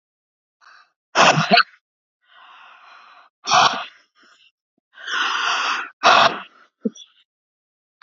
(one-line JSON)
{"exhalation_length": "8.0 s", "exhalation_amplitude": 28454, "exhalation_signal_mean_std_ratio": 0.37, "survey_phase": "beta (2021-08-13 to 2022-03-07)", "age": "18-44", "gender": "Female", "wearing_mask": "No", "symptom_cough_any": true, "symptom_runny_or_blocked_nose": true, "symptom_fatigue": true, "symptom_onset": "6 days", "smoker_status": "Never smoked", "respiratory_condition_asthma": false, "respiratory_condition_other": false, "recruitment_source": "REACT", "submission_delay": "1 day", "covid_test_result": "Positive", "covid_test_method": "RT-qPCR", "covid_ct_value": 27.0, "covid_ct_gene": "E gene", "influenza_a_test_result": "Negative", "influenza_b_test_result": "Negative"}